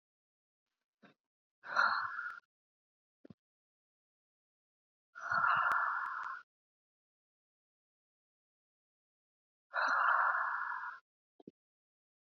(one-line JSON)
{"exhalation_length": "12.4 s", "exhalation_amplitude": 3680, "exhalation_signal_mean_std_ratio": 0.38, "survey_phase": "beta (2021-08-13 to 2022-03-07)", "age": "18-44", "gender": "Female", "wearing_mask": "No", "symptom_fatigue": true, "symptom_headache": true, "symptom_onset": "5 days", "smoker_status": "Ex-smoker", "respiratory_condition_asthma": false, "respiratory_condition_other": false, "recruitment_source": "REACT", "submission_delay": "1 day", "covid_test_result": "Negative", "covid_test_method": "RT-qPCR", "influenza_a_test_result": "Negative", "influenza_b_test_result": "Negative"}